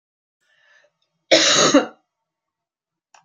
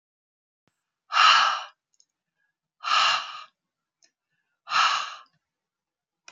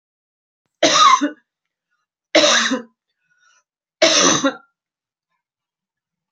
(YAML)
cough_length: 3.2 s
cough_amplitude: 30435
cough_signal_mean_std_ratio: 0.33
exhalation_length: 6.3 s
exhalation_amplitude: 20207
exhalation_signal_mean_std_ratio: 0.35
three_cough_length: 6.3 s
three_cough_amplitude: 30358
three_cough_signal_mean_std_ratio: 0.38
survey_phase: beta (2021-08-13 to 2022-03-07)
age: 45-64
gender: Female
wearing_mask: 'No'
symptom_none: true
smoker_status: Never smoked
respiratory_condition_asthma: false
respiratory_condition_other: false
recruitment_source: REACT
submission_delay: 1 day
covid_test_result: Negative
covid_test_method: RT-qPCR